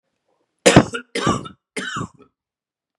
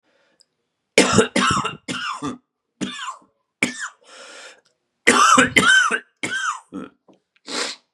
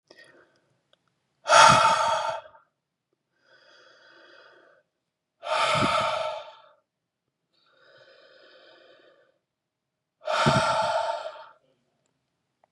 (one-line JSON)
{"three_cough_length": "3.0 s", "three_cough_amplitude": 32768, "three_cough_signal_mean_std_ratio": 0.31, "cough_length": "7.9 s", "cough_amplitude": 32767, "cough_signal_mean_std_ratio": 0.45, "exhalation_length": "12.7 s", "exhalation_amplitude": 25036, "exhalation_signal_mean_std_ratio": 0.35, "survey_phase": "beta (2021-08-13 to 2022-03-07)", "age": "45-64", "gender": "Male", "wearing_mask": "No", "symptom_cough_any": true, "symptom_runny_or_blocked_nose": true, "symptom_sore_throat": true, "symptom_diarrhoea": true, "symptom_fatigue": true, "symptom_fever_high_temperature": true, "symptom_headache": true, "symptom_change_to_sense_of_smell_or_taste": true, "symptom_onset": "3 days", "smoker_status": "Never smoked", "respiratory_condition_asthma": false, "respiratory_condition_other": false, "recruitment_source": "Test and Trace", "submission_delay": "1 day", "covid_test_result": "Positive", "covid_test_method": "RT-qPCR", "covid_ct_value": 15.8, "covid_ct_gene": "ORF1ab gene"}